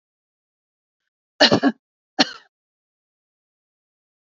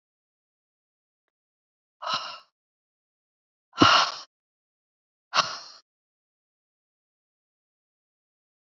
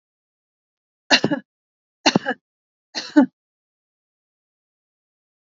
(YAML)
cough_length: 4.3 s
cough_amplitude: 32552
cough_signal_mean_std_ratio: 0.21
exhalation_length: 8.7 s
exhalation_amplitude: 24235
exhalation_signal_mean_std_ratio: 0.2
three_cough_length: 5.5 s
three_cough_amplitude: 29194
three_cough_signal_mean_std_ratio: 0.22
survey_phase: beta (2021-08-13 to 2022-03-07)
age: 45-64
gender: Female
wearing_mask: 'No'
symptom_none: true
smoker_status: Never smoked
respiratory_condition_asthma: false
respiratory_condition_other: false
recruitment_source: REACT
submission_delay: 2 days
covid_test_result: Negative
covid_test_method: RT-qPCR
influenza_a_test_result: Negative
influenza_b_test_result: Negative